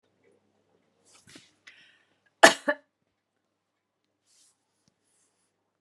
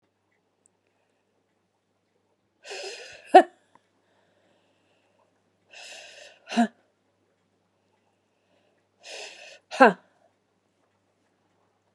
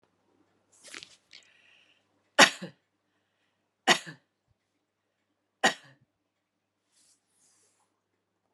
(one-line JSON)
{"cough_length": "5.8 s", "cough_amplitude": 32768, "cough_signal_mean_std_ratio": 0.12, "exhalation_length": "11.9 s", "exhalation_amplitude": 28716, "exhalation_signal_mean_std_ratio": 0.15, "three_cough_length": "8.5 s", "three_cough_amplitude": 28696, "three_cough_signal_mean_std_ratio": 0.15, "survey_phase": "beta (2021-08-13 to 2022-03-07)", "age": "45-64", "gender": "Female", "wearing_mask": "No", "symptom_other": true, "smoker_status": "Never smoked", "respiratory_condition_asthma": false, "respiratory_condition_other": true, "recruitment_source": "Test and Trace", "submission_delay": "2 days", "covid_test_result": "Positive", "covid_test_method": "RT-qPCR", "covid_ct_value": 34.4, "covid_ct_gene": "N gene", "covid_ct_mean": 35.3, "covid_viral_load": "2.6 copies/ml", "covid_viral_load_category": "Minimal viral load (< 10K copies/ml)"}